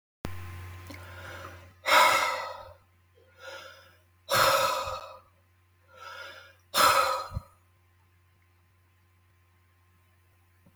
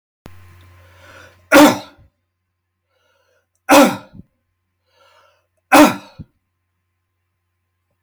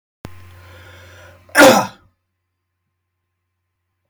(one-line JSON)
{"exhalation_length": "10.8 s", "exhalation_amplitude": 12616, "exhalation_signal_mean_std_ratio": 0.38, "three_cough_length": "8.0 s", "three_cough_amplitude": 32768, "three_cough_signal_mean_std_ratio": 0.25, "cough_length": "4.1 s", "cough_amplitude": 32768, "cough_signal_mean_std_ratio": 0.24, "survey_phase": "beta (2021-08-13 to 2022-03-07)", "age": "45-64", "gender": "Male", "wearing_mask": "No", "symptom_none": true, "smoker_status": "Ex-smoker", "respiratory_condition_asthma": false, "respiratory_condition_other": false, "recruitment_source": "REACT", "submission_delay": "3 days", "covid_test_result": "Negative", "covid_test_method": "RT-qPCR", "influenza_a_test_result": "Negative", "influenza_b_test_result": "Negative"}